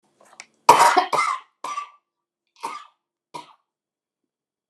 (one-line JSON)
{"cough_length": "4.7 s", "cough_amplitude": 29204, "cough_signal_mean_std_ratio": 0.29, "survey_phase": "alpha (2021-03-01 to 2021-08-12)", "age": "45-64", "gender": "Female", "wearing_mask": "No", "symptom_none": true, "smoker_status": "Never smoked", "respiratory_condition_asthma": false, "respiratory_condition_other": false, "recruitment_source": "REACT", "submission_delay": "3 days", "covid_test_result": "Negative", "covid_test_method": "RT-qPCR"}